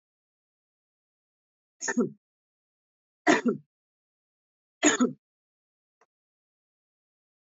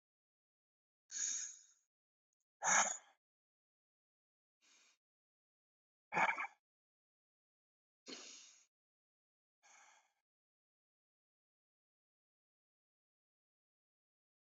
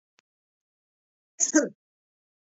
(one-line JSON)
{"three_cough_length": "7.6 s", "three_cough_amplitude": 14719, "three_cough_signal_mean_std_ratio": 0.23, "exhalation_length": "14.5 s", "exhalation_amplitude": 3623, "exhalation_signal_mean_std_ratio": 0.2, "cough_length": "2.6 s", "cough_amplitude": 13143, "cough_signal_mean_std_ratio": 0.22, "survey_phase": "beta (2021-08-13 to 2022-03-07)", "age": "18-44", "gender": "Male", "wearing_mask": "No", "symptom_runny_or_blocked_nose": true, "smoker_status": "Ex-smoker", "respiratory_condition_asthma": false, "respiratory_condition_other": false, "recruitment_source": "Test and Trace", "submission_delay": "1 day", "covid_test_result": "Positive", "covid_test_method": "RT-qPCR", "covid_ct_value": 12.5, "covid_ct_gene": "ORF1ab gene"}